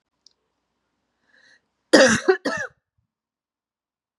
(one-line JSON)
{"cough_length": "4.2 s", "cough_amplitude": 32678, "cough_signal_mean_std_ratio": 0.25, "survey_phase": "beta (2021-08-13 to 2022-03-07)", "age": "18-44", "gender": "Female", "wearing_mask": "No", "symptom_cough_any": true, "symptom_shortness_of_breath": true, "symptom_sore_throat": true, "symptom_headache": true, "symptom_onset": "1 day", "smoker_status": "Never smoked", "respiratory_condition_asthma": true, "respiratory_condition_other": false, "recruitment_source": "Test and Trace", "submission_delay": "1 day", "covid_test_result": "Positive", "covid_test_method": "RT-qPCR", "covid_ct_value": 36.8, "covid_ct_gene": "N gene"}